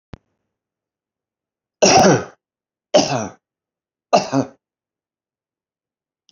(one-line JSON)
{"three_cough_length": "6.3 s", "three_cough_amplitude": 32767, "three_cough_signal_mean_std_ratio": 0.29, "survey_phase": "beta (2021-08-13 to 2022-03-07)", "age": "65+", "gender": "Male", "wearing_mask": "No", "symptom_cough_any": true, "symptom_fever_high_temperature": true, "symptom_headache": true, "symptom_onset": "4 days", "smoker_status": "Ex-smoker", "respiratory_condition_asthma": false, "respiratory_condition_other": false, "recruitment_source": "Test and Trace", "submission_delay": "2 days", "covid_test_result": "Positive", "covid_test_method": "RT-qPCR", "covid_ct_value": 12.7, "covid_ct_gene": "ORF1ab gene", "covid_ct_mean": 13.2, "covid_viral_load": "47000000 copies/ml", "covid_viral_load_category": "High viral load (>1M copies/ml)"}